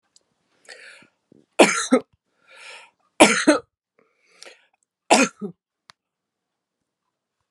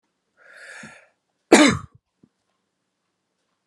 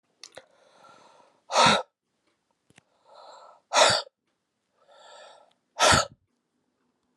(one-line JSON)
{"three_cough_length": "7.5 s", "three_cough_amplitude": 32768, "three_cough_signal_mean_std_ratio": 0.25, "cough_length": "3.7 s", "cough_amplitude": 32768, "cough_signal_mean_std_ratio": 0.21, "exhalation_length": "7.2 s", "exhalation_amplitude": 16568, "exhalation_signal_mean_std_ratio": 0.28, "survey_phase": "alpha (2021-03-01 to 2021-08-12)", "age": "45-64", "gender": "Female", "wearing_mask": "No", "symptom_none": true, "smoker_status": "Ex-smoker", "respiratory_condition_asthma": false, "respiratory_condition_other": false, "recruitment_source": "REACT", "submission_delay": "1 day", "covid_test_result": "Negative", "covid_test_method": "RT-qPCR"}